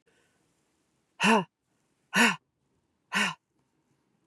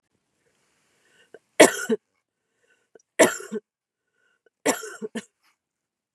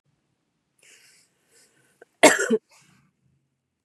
{"exhalation_length": "4.3 s", "exhalation_amplitude": 10963, "exhalation_signal_mean_std_ratio": 0.3, "three_cough_length": "6.1 s", "three_cough_amplitude": 32767, "three_cough_signal_mean_std_ratio": 0.21, "cough_length": "3.8 s", "cough_amplitude": 32468, "cough_signal_mean_std_ratio": 0.2, "survey_phase": "beta (2021-08-13 to 2022-03-07)", "age": "18-44", "gender": "Female", "wearing_mask": "No", "symptom_none": true, "symptom_onset": "3 days", "smoker_status": "Never smoked", "respiratory_condition_asthma": false, "respiratory_condition_other": false, "recruitment_source": "REACT", "submission_delay": "1 day", "covid_test_result": "Negative", "covid_test_method": "RT-qPCR", "influenza_a_test_result": "Negative", "influenza_b_test_result": "Negative"}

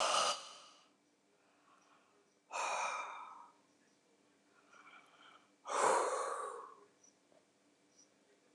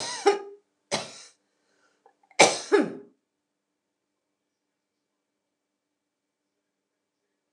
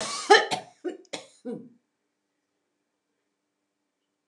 {"exhalation_length": "8.5 s", "exhalation_amplitude": 3251, "exhalation_signal_mean_std_ratio": 0.41, "three_cough_length": "7.5 s", "three_cough_amplitude": 26787, "three_cough_signal_mean_std_ratio": 0.22, "cough_length": "4.3 s", "cough_amplitude": 22921, "cough_signal_mean_std_ratio": 0.23, "survey_phase": "alpha (2021-03-01 to 2021-08-12)", "age": "65+", "gender": "Female", "wearing_mask": "No", "symptom_none": true, "smoker_status": "Never smoked", "respiratory_condition_asthma": false, "respiratory_condition_other": false, "recruitment_source": "REACT", "submission_delay": "1 day", "covid_test_result": "Negative", "covid_test_method": "RT-qPCR"}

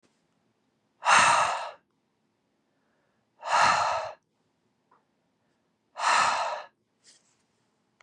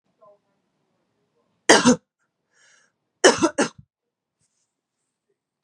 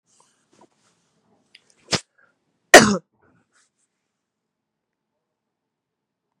{"exhalation_length": "8.0 s", "exhalation_amplitude": 15691, "exhalation_signal_mean_std_ratio": 0.38, "three_cough_length": "5.6 s", "three_cough_amplitude": 32625, "three_cough_signal_mean_std_ratio": 0.23, "cough_length": "6.4 s", "cough_amplitude": 32768, "cough_signal_mean_std_ratio": 0.14, "survey_phase": "beta (2021-08-13 to 2022-03-07)", "age": "18-44", "gender": "Female", "wearing_mask": "No", "symptom_cough_any": true, "symptom_runny_or_blocked_nose": true, "symptom_fatigue": true, "symptom_headache": true, "symptom_onset": "3 days", "smoker_status": "Never smoked", "respiratory_condition_asthma": false, "respiratory_condition_other": false, "recruitment_source": "Test and Trace", "submission_delay": "1 day", "covid_test_result": "Positive", "covid_test_method": "RT-qPCR", "covid_ct_value": 16.1, "covid_ct_gene": "N gene", "covid_ct_mean": 16.2, "covid_viral_load": "4800000 copies/ml", "covid_viral_load_category": "High viral load (>1M copies/ml)"}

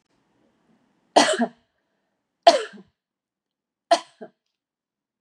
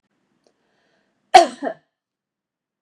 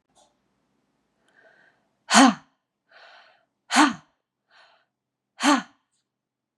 {"three_cough_length": "5.2 s", "three_cough_amplitude": 31518, "three_cough_signal_mean_std_ratio": 0.22, "cough_length": "2.8 s", "cough_amplitude": 32768, "cough_signal_mean_std_ratio": 0.18, "exhalation_length": "6.6 s", "exhalation_amplitude": 28903, "exhalation_signal_mean_std_ratio": 0.23, "survey_phase": "beta (2021-08-13 to 2022-03-07)", "age": "45-64", "gender": "Female", "wearing_mask": "No", "symptom_cough_any": true, "symptom_runny_or_blocked_nose": true, "symptom_fatigue": true, "smoker_status": "Never smoked", "respiratory_condition_asthma": false, "respiratory_condition_other": false, "recruitment_source": "Test and Trace", "submission_delay": "2 days", "covid_test_result": "Positive", "covid_test_method": "LFT"}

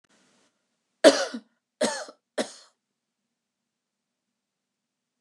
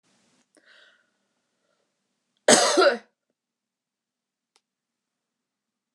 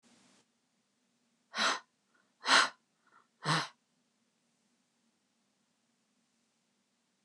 {"three_cough_length": "5.2 s", "three_cough_amplitude": 26594, "three_cough_signal_mean_std_ratio": 0.19, "cough_length": "5.9 s", "cough_amplitude": 28973, "cough_signal_mean_std_ratio": 0.22, "exhalation_length": "7.2 s", "exhalation_amplitude": 8420, "exhalation_signal_mean_std_ratio": 0.23, "survey_phase": "beta (2021-08-13 to 2022-03-07)", "age": "45-64", "gender": "Female", "wearing_mask": "No", "symptom_none": true, "symptom_onset": "12 days", "smoker_status": "Never smoked", "respiratory_condition_asthma": false, "respiratory_condition_other": false, "recruitment_source": "REACT", "submission_delay": "2 days", "covid_test_result": "Negative", "covid_test_method": "RT-qPCR", "influenza_a_test_result": "Negative", "influenza_b_test_result": "Negative"}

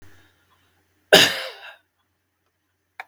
{"cough_length": "3.1 s", "cough_amplitude": 32768, "cough_signal_mean_std_ratio": 0.22, "survey_phase": "beta (2021-08-13 to 2022-03-07)", "age": "65+", "gender": "Male", "wearing_mask": "No", "symptom_none": true, "smoker_status": "Never smoked", "respiratory_condition_asthma": false, "respiratory_condition_other": true, "recruitment_source": "REACT", "submission_delay": "1 day", "covid_test_result": "Negative", "covid_test_method": "RT-qPCR", "influenza_a_test_result": "Negative", "influenza_b_test_result": "Negative"}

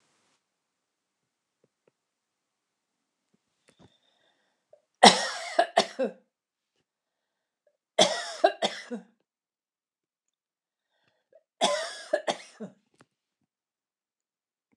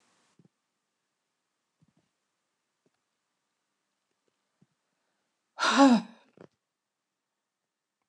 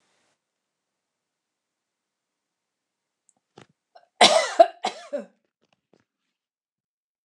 {"three_cough_length": "14.8 s", "three_cough_amplitude": 29204, "three_cough_signal_mean_std_ratio": 0.21, "exhalation_length": "8.1 s", "exhalation_amplitude": 12220, "exhalation_signal_mean_std_ratio": 0.18, "cough_length": "7.2 s", "cough_amplitude": 29090, "cough_signal_mean_std_ratio": 0.18, "survey_phase": "beta (2021-08-13 to 2022-03-07)", "age": "65+", "gender": "Female", "wearing_mask": "No", "symptom_none": true, "smoker_status": "Never smoked", "respiratory_condition_asthma": false, "respiratory_condition_other": false, "recruitment_source": "REACT", "submission_delay": "3 days", "covid_test_result": "Negative", "covid_test_method": "RT-qPCR"}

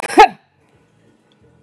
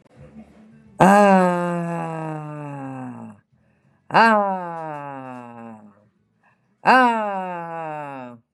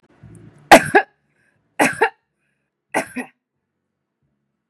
{"cough_length": "1.6 s", "cough_amplitude": 32768, "cough_signal_mean_std_ratio": 0.24, "exhalation_length": "8.5 s", "exhalation_amplitude": 32767, "exhalation_signal_mean_std_ratio": 0.45, "three_cough_length": "4.7 s", "three_cough_amplitude": 32768, "three_cough_signal_mean_std_ratio": 0.23, "survey_phase": "beta (2021-08-13 to 2022-03-07)", "age": "45-64", "gender": "Female", "wearing_mask": "No", "symptom_none": true, "smoker_status": "Current smoker (11 or more cigarettes per day)", "respiratory_condition_asthma": false, "respiratory_condition_other": false, "recruitment_source": "REACT", "submission_delay": "5 days", "covid_test_result": "Negative", "covid_test_method": "RT-qPCR", "influenza_a_test_result": "Unknown/Void", "influenza_b_test_result": "Unknown/Void"}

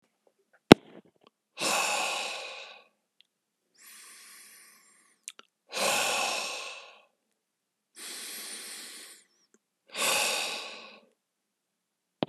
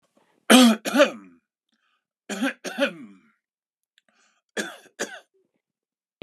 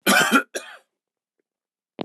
{"exhalation_length": "12.3 s", "exhalation_amplitude": 32768, "exhalation_signal_mean_std_ratio": 0.28, "three_cough_length": "6.2 s", "three_cough_amplitude": 32768, "three_cough_signal_mean_std_ratio": 0.28, "cough_length": "2.0 s", "cough_amplitude": 21829, "cough_signal_mean_std_ratio": 0.36, "survey_phase": "beta (2021-08-13 to 2022-03-07)", "age": "45-64", "gender": "Male", "wearing_mask": "No", "symptom_none": true, "smoker_status": "Never smoked", "respiratory_condition_asthma": false, "respiratory_condition_other": false, "recruitment_source": "REACT", "submission_delay": "4 days", "covid_test_result": "Negative", "covid_test_method": "RT-qPCR", "influenza_a_test_result": "Negative", "influenza_b_test_result": "Negative"}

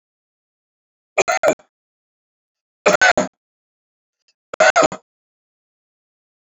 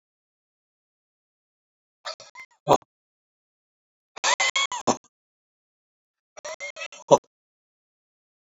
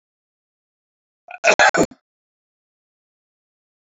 {"three_cough_length": "6.5 s", "three_cough_amplitude": 29500, "three_cough_signal_mean_std_ratio": 0.27, "exhalation_length": "8.4 s", "exhalation_amplitude": 28013, "exhalation_signal_mean_std_ratio": 0.21, "cough_length": "3.9 s", "cough_amplitude": 29292, "cough_signal_mean_std_ratio": 0.22, "survey_phase": "alpha (2021-03-01 to 2021-08-12)", "age": "65+", "gender": "Male", "wearing_mask": "No", "symptom_none": true, "smoker_status": "Never smoked", "respiratory_condition_asthma": false, "respiratory_condition_other": false, "recruitment_source": "REACT", "submission_delay": "1 day", "covid_test_result": "Negative", "covid_test_method": "RT-qPCR"}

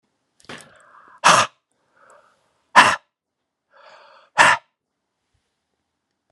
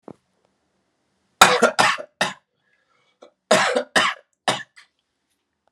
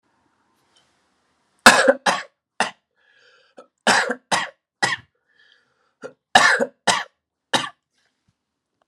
{"exhalation_length": "6.3 s", "exhalation_amplitude": 32768, "exhalation_signal_mean_std_ratio": 0.24, "cough_length": "5.7 s", "cough_amplitude": 32768, "cough_signal_mean_std_ratio": 0.33, "three_cough_length": "8.9 s", "three_cough_amplitude": 32768, "three_cough_signal_mean_std_ratio": 0.29, "survey_phase": "alpha (2021-03-01 to 2021-08-12)", "age": "45-64", "gender": "Male", "wearing_mask": "No", "symptom_headache": true, "symptom_change_to_sense_of_smell_or_taste": true, "symptom_loss_of_taste": true, "smoker_status": "Never smoked", "respiratory_condition_asthma": false, "respiratory_condition_other": false, "recruitment_source": "Test and Trace", "submission_delay": "3 days", "covid_test_result": "Positive", "covid_test_method": "RT-qPCR"}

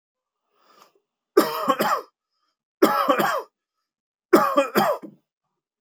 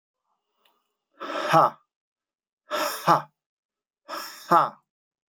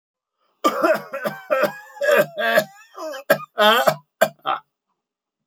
{"three_cough_length": "5.8 s", "three_cough_amplitude": 25319, "three_cough_signal_mean_std_ratio": 0.41, "exhalation_length": "5.3 s", "exhalation_amplitude": 16822, "exhalation_signal_mean_std_ratio": 0.33, "cough_length": "5.5 s", "cough_amplitude": 30135, "cough_signal_mean_std_ratio": 0.48, "survey_phase": "beta (2021-08-13 to 2022-03-07)", "age": "45-64", "gender": "Male", "wearing_mask": "No", "symptom_none": true, "smoker_status": "Ex-smoker", "respiratory_condition_asthma": false, "respiratory_condition_other": false, "recruitment_source": "REACT", "submission_delay": "1 day", "covid_test_result": "Negative", "covid_test_method": "RT-qPCR", "influenza_a_test_result": "Unknown/Void", "influenza_b_test_result": "Unknown/Void"}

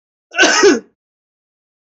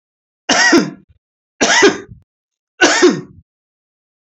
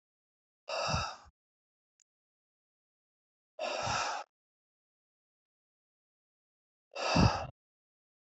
{"cough_length": "2.0 s", "cough_amplitude": 29812, "cough_signal_mean_std_ratio": 0.39, "three_cough_length": "4.3 s", "three_cough_amplitude": 30268, "three_cough_signal_mean_std_ratio": 0.43, "exhalation_length": "8.3 s", "exhalation_amplitude": 7166, "exhalation_signal_mean_std_ratio": 0.31, "survey_phase": "beta (2021-08-13 to 2022-03-07)", "age": "65+", "gender": "Male", "wearing_mask": "No", "symptom_none": true, "smoker_status": "Never smoked", "respiratory_condition_asthma": false, "respiratory_condition_other": false, "recruitment_source": "REACT", "submission_delay": "2 days", "covid_test_result": "Negative", "covid_test_method": "RT-qPCR", "influenza_a_test_result": "Negative", "influenza_b_test_result": "Negative"}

